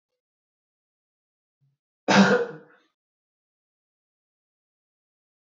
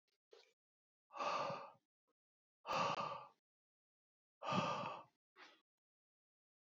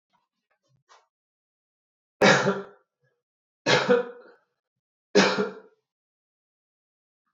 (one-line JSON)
{"cough_length": "5.5 s", "cough_amplitude": 20310, "cough_signal_mean_std_ratio": 0.21, "exhalation_length": "6.7 s", "exhalation_amplitude": 1855, "exhalation_signal_mean_std_ratio": 0.4, "three_cough_length": "7.3 s", "three_cough_amplitude": 18617, "three_cough_signal_mean_std_ratio": 0.3, "survey_phase": "beta (2021-08-13 to 2022-03-07)", "age": "18-44", "gender": "Male", "wearing_mask": "No", "symptom_runny_or_blocked_nose": true, "symptom_fatigue": true, "symptom_change_to_sense_of_smell_or_taste": true, "smoker_status": "Never smoked", "respiratory_condition_asthma": false, "respiratory_condition_other": false, "recruitment_source": "Test and Trace", "submission_delay": "2 days", "covid_test_result": "Positive", "covid_test_method": "RT-qPCR", "covid_ct_value": 14.9, "covid_ct_gene": "ORF1ab gene", "covid_ct_mean": 15.2, "covid_viral_load": "10000000 copies/ml", "covid_viral_load_category": "High viral load (>1M copies/ml)"}